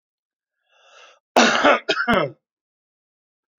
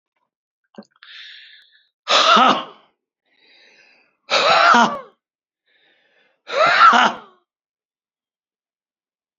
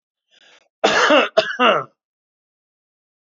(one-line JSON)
{"cough_length": "3.6 s", "cough_amplitude": 27396, "cough_signal_mean_std_ratio": 0.36, "exhalation_length": "9.4 s", "exhalation_amplitude": 32768, "exhalation_signal_mean_std_ratio": 0.36, "three_cough_length": "3.2 s", "three_cough_amplitude": 28382, "three_cough_signal_mean_std_ratio": 0.39, "survey_phase": "alpha (2021-03-01 to 2021-08-12)", "age": "65+", "gender": "Male", "wearing_mask": "No", "symptom_none": true, "symptom_onset": "8 days", "smoker_status": "Never smoked", "respiratory_condition_asthma": true, "respiratory_condition_other": false, "recruitment_source": "REACT", "submission_delay": "2 days", "covid_test_result": "Negative", "covid_test_method": "RT-qPCR"}